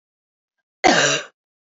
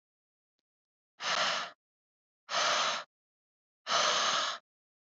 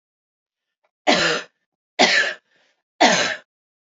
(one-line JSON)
{"cough_length": "1.7 s", "cough_amplitude": 27035, "cough_signal_mean_std_ratio": 0.36, "exhalation_length": "5.1 s", "exhalation_amplitude": 5230, "exhalation_signal_mean_std_ratio": 0.48, "three_cough_length": "3.8 s", "three_cough_amplitude": 28378, "three_cough_signal_mean_std_ratio": 0.4, "survey_phase": "beta (2021-08-13 to 2022-03-07)", "age": "18-44", "gender": "Female", "wearing_mask": "Yes", "symptom_runny_or_blocked_nose": true, "smoker_status": "Never smoked", "respiratory_condition_asthma": false, "respiratory_condition_other": false, "recruitment_source": "Test and Trace", "submission_delay": "1 day", "covid_test_result": "Positive", "covid_test_method": "RT-qPCR", "covid_ct_value": 20.3, "covid_ct_gene": "ORF1ab gene"}